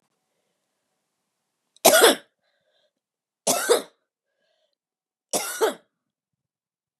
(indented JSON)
{
  "three_cough_length": "7.0 s",
  "three_cough_amplitude": 32768,
  "three_cough_signal_mean_std_ratio": 0.26,
  "survey_phase": "beta (2021-08-13 to 2022-03-07)",
  "age": "45-64",
  "gender": "Female",
  "wearing_mask": "No",
  "symptom_runny_or_blocked_nose": true,
  "symptom_headache": true,
  "symptom_other": true,
  "symptom_onset": "3 days",
  "smoker_status": "Never smoked",
  "respiratory_condition_asthma": false,
  "respiratory_condition_other": false,
  "recruitment_source": "Test and Trace",
  "submission_delay": "1 day",
  "covid_test_result": "Positive",
  "covid_test_method": "RT-qPCR",
  "covid_ct_value": 12.5,
  "covid_ct_gene": "ORF1ab gene",
  "covid_ct_mean": 14.0,
  "covid_viral_load": "26000000 copies/ml",
  "covid_viral_load_category": "High viral load (>1M copies/ml)"
}